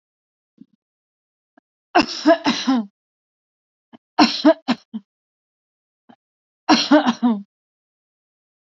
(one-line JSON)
{"three_cough_length": "8.8 s", "three_cough_amplitude": 28261, "three_cough_signal_mean_std_ratio": 0.32, "survey_phase": "beta (2021-08-13 to 2022-03-07)", "age": "18-44", "gender": "Female", "wearing_mask": "No", "symptom_cough_any": true, "symptom_headache": true, "symptom_other": true, "symptom_onset": "3 days", "smoker_status": "Never smoked", "respiratory_condition_asthma": false, "respiratory_condition_other": false, "recruitment_source": "Test and Trace", "submission_delay": "2 days", "covid_test_result": "Positive", "covid_test_method": "RT-qPCR", "covid_ct_value": 25.9, "covid_ct_gene": "N gene"}